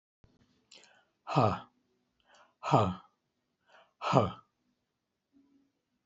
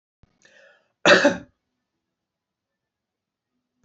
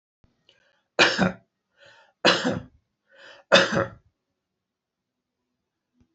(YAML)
exhalation_length: 6.1 s
exhalation_amplitude: 14388
exhalation_signal_mean_std_ratio: 0.27
cough_length: 3.8 s
cough_amplitude: 25666
cough_signal_mean_std_ratio: 0.21
three_cough_length: 6.1 s
three_cough_amplitude: 26415
three_cough_signal_mean_std_ratio: 0.29
survey_phase: alpha (2021-03-01 to 2021-08-12)
age: 65+
gender: Male
wearing_mask: 'No'
symptom_none: true
smoker_status: Never smoked
respiratory_condition_asthma: false
respiratory_condition_other: false
recruitment_source: REACT
submission_delay: 1 day
covid_test_result: Negative
covid_test_method: RT-qPCR